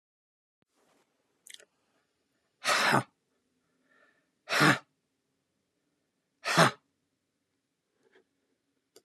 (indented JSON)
{
  "exhalation_length": "9.0 s",
  "exhalation_amplitude": 13767,
  "exhalation_signal_mean_std_ratio": 0.24,
  "survey_phase": "beta (2021-08-13 to 2022-03-07)",
  "age": "65+",
  "gender": "Male",
  "wearing_mask": "No",
  "symptom_cough_any": true,
  "symptom_runny_or_blocked_nose": true,
  "symptom_sore_throat": true,
  "symptom_onset": "3 days",
  "smoker_status": "Ex-smoker",
  "respiratory_condition_asthma": false,
  "respiratory_condition_other": false,
  "recruitment_source": "Test and Trace",
  "submission_delay": "2 days",
  "covid_test_result": "Positive",
  "covid_test_method": "RT-qPCR"
}